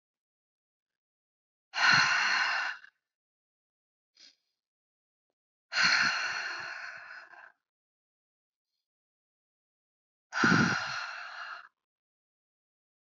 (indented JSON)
{
  "exhalation_length": "13.1 s",
  "exhalation_amplitude": 8533,
  "exhalation_signal_mean_std_ratio": 0.36,
  "survey_phase": "alpha (2021-03-01 to 2021-08-12)",
  "age": "18-44",
  "gender": "Female",
  "wearing_mask": "No",
  "symptom_none": true,
  "smoker_status": "Ex-smoker",
  "respiratory_condition_asthma": false,
  "respiratory_condition_other": false,
  "recruitment_source": "REACT",
  "submission_delay": "1 day",
  "covid_test_result": "Negative",
  "covid_test_method": "RT-qPCR"
}